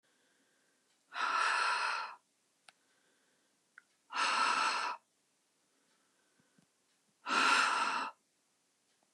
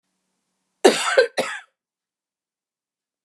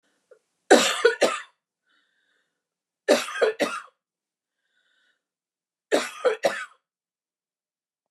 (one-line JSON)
{"exhalation_length": "9.1 s", "exhalation_amplitude": 4860, "exhalation_signal_mean_std_ratio": 0.45, "cough_length": "3.2 s", "cough_amplitude": 31045, "cough_signal_mean_std_ratio": 0.28, "three_cough_length": "8.1 s", "three_cough_amplitude": 26713, "three_cough_signal_mean_std_ratio": 0.31, "survey_phase": "beta (2021-08-13 to 2022-03-07)", "age": "45-64", "gender": "Female", "wearing_mask": "No", "symptom_none": true, "smoker_status": "Ex-smoker", "respiratory_condition_asthma": false, "respiratory_condition_other": false, "recruitment_source": "REACT", "submission_delay": "2 days", "covid_test_result": "Negative", "covid_test_method": "RT-qPCR", "influenza_a_test_result": "Negative", "influenza_b_test_result": "Negative"}